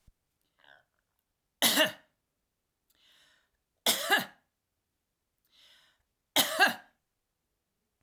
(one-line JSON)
{"three_cough_length": "8.0 s", "three_cough_amplitude": 10026, "three_cough_signal_mean_std_ratio": 0.26, "survey_phase": "alpha (2021-03-01 to 2021-08-12)", "age": "65+", "gender": "Female", "wearing_mask": "No", "symptom_none": true, "smoker_status": "Ex-smoker", "respiratory_condition_asthma": false, "respiratory_condition_other": false, "recruitment_source": "REACT", "submission_delay": "1 day", "covid_test_result": "Negative", "covid_test_method": "RT-qPCR"}